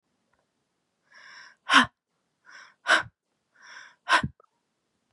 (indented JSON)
{
  "exhalation_length": "5.1 s",
  "exhalation_amplitude": 19616,
  "exhalation_signal_mean_std_ratio": 0.24,
  "survey_phase": "beta (2021-08-13 to 2022-03-07)",
  "age": "18-44",
  "gender": "Female",
  "wearing_mask": "No",
  "symptom_cough_any": true,
  "symptom_sore_throat": true,
  "smoker_status": "Never smoked",
  "respiratory_condition_asthma": true,
  "respiratory_condition_other": false,
  "recruitment_source": "REACT",
  "submission_delay": "2 days",
  "covid_test_result": "Negative",
  "covid_test_method": "RT-qPCR",
  "influenza_a_test_result": "Negative",
  "influenza_b_test_result": "Negative"
}